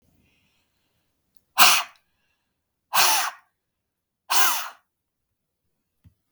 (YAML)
exhalation_length: 6.3 s
exhalation_amplitude: 32768
exhalation_signal_mean_std_ratio: 0.29
survey_phase: beta (2021-08-13 to 2022-03-07)
age: 45-64
gender: Female
wearing_mask: 'No'
symptom_none: true
smoker_status: Never smoked
respiratory_condition_asthma: false
respiratory_condition_other: false
recruitment_source: REACT
submission_delay: 0 days
covid_test_result: Negative
covid_test_method: RT-qPCR